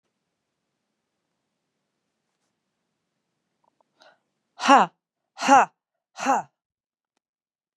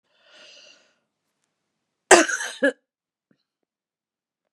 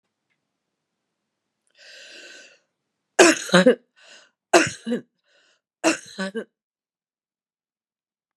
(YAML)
exhalation_length: 7.8 s
exhalation_amplitude: 27773
exhalation_signal_mean_std_ratio: 0.2
cough_length: 4.5 s
cough_amplitude: 32767
cough_signal_mean_std_ratio: 0.2
three_cough_length: 8.4 s
three_cough_amplitude: 32651
three_cough_signal_mean_std_ratio: 0.25
survey_phase: beta (2021-08-13 to 2022-03-07)
age: 65+
gender: Female
wearing_mask: 'No'
symptom_cough_any: true
symptom_shortness_of_breath: true
symptom_fatigue: true
smoker_status: Ex-smoker
respiratory_condition_asthma: false
respiratory_condition_other: false
recruitment_source: REACT
submission_delay: 1 day
covid_test_result: Negative
covid_test_method: RT-qPCR